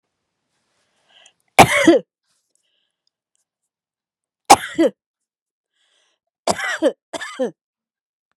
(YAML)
three_cough_length: 8.4 s
three_cough_amplitude: 32768
three_cough_signal_mean_std_ratio: 0.25
survey_phase: beta (2021-08-13 to 2022-03-07)
age: 65+
gender: Female
wearing_mask: 'No'
symptom_none: true
smoker_status: Never smoked
respiratory_condition_asthma: false
respiratory_condition_other: false
recruitment_source: REACT
submission_delay: 6 days
covid_test_result: Negative
covid_test_method: RT-qPCR
influenza_a_test_result: Negative
influenza_b_test_result: Negative